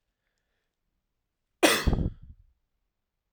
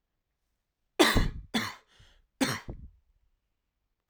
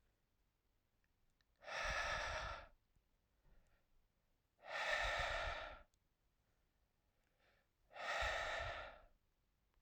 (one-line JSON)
{"cough_length": "3.3 s", "cough_amplitude": 20925, "cough_signal_mean_std_ratio": 0.27, "three_cough_length": "4.1 s", "three_cough_amplitude": 16763, "three_cough_signal_mean_std_ratio": 0.31, "exhalation_length": "9.8 s", "exhalation_amplitude": 1154, "exhalation_signal_mean_std_ratio": 0.48, "survey_phase": "alpha (2021-03-01 to 2021-08-12)", "age": "18-44", "gender": "Male", "wearing_mask": "No", "symptom_none": true, "smoker_status": "Never smoked", "respiratory_condition_asthma": true, "respiratory_condition_other": false, "recruitment_source": "REACT", "submission_delay": "1 day", "covid_test_result": "Negative", "covid_test_method": "RT-qPCR"}